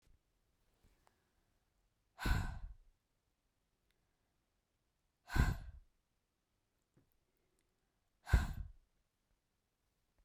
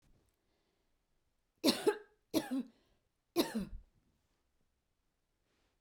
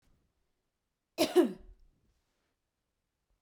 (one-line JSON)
{"exhalation_length": "10.2 s", "exhalation_amplitude": 5017, "exhalation_signal_mean_std_ratio": 0.23, "three_cough_length": "5.8 s", "three_cough_amplitude": 5623, "three_cough_signal_mean_std_ratio": 0.28, "cough_length": "3.4 s", "cough_amplitude": 7303, "cough_signal_mean_std_ratio": 0.22, "survey_phase": "beta (2021-08-13 to 2022-03-07)", "age": "45-64", "gender": "Female", "wearing_mask": "No", "symptom_none": true, "smoker_status": "Ex-smoker", "respiratory_condition_asthma": false, "respiratory_condition_other": false, "recruitment_source": "REACT", "submission_delay": "2 days", "covid_test_result": "Negative", "covid_test_method": "RT-qPCR"}